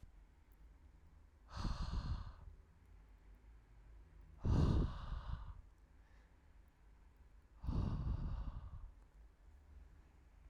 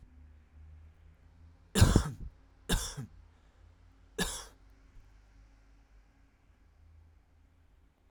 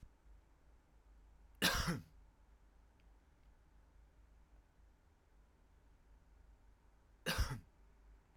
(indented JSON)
{
  "exhalation_length": "10.5 s",
  "exhalation_amplitude": 2510,
  "exhalation_signal_mean_std_ratio": 0.48,
  "three_cough_length": "8.1 s",
  "three_cough_amplitude": 12141,
  "three_cough_signal_mean_std_ratio": 0.26,
  "cough_length": "8.4 s",
  "cough_amplitude": 3199,
  "cough_signal_mean_std_ratio": 0.31,
  "survey_phase": "alpha (2021-03-01 to 2021-08-12)",
  "age": "18-44",
  "gender": "Male",
  "wearing_mask": "No",
  "symptom_fatigue": true,
  "symptom_fever_high_temperature": true,
  "symptom_headache": true,
  "symptom_onset": "2 days",
  "smoker_status": "Current smoker (1 to 10 cigarettes per day)",
  "respiratory_condition_asthma": false,
  "respiratory_condition_other": false,
  "recruitment_source": "Test and Trace",
  "submission_delay": "1 day",
  "covid_test_result": "Positive",
  "covid_test_method": "RT-qPCR",
  "covid_ct_value": 27.7,
  "covid_ct_gene": "ORF1ab gene",
  "covid_ct_mean": 28.3,
  "covid_viral_load": "520 copies/ml",
  "covid_viral_load_category": "Minimal viral load (< 10K copies/ml)"
}